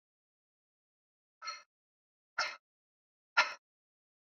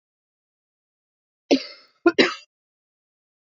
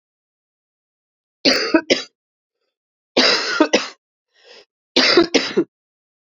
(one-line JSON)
{"exhalation_length": "4.3 s", "exhalation_amplitude": 8225, "exhalation_signal_mean_std_ratio": 0.19, "cough_length": "3.6 s", "cough_amplitude": 23473, "cough_signal_mean_std_ratio": 0.21, "three_cough_length": "6.3 s", "three_cough_amplitude": 32767, "three_cough_signal_mean_std_ratio": 0.38, "survey_phase": "beta (2021-08-13 to 2022-03-07)", "age": "45-64", "gender": "Female", "wearing_mask": "No", "symptom_cough_any": true, "symptom_runny_or_blocked_nose": true, "symptom_sore_throat": true, "symptom_fatigue": true, "symptom_headache": true, "symptom_change_to_sense_of_smell_or_taste": true, "symptom_onset": "2 days", "smoker_status": "Ex-smoker", "respiratory_condition_asthma": false, "respiratory_condition_other": false, "recruitment_source": "Test and Trace", "submission_delay": "2 days", "covid_test_result": "Positive", "covid_test_method": "ePCR"}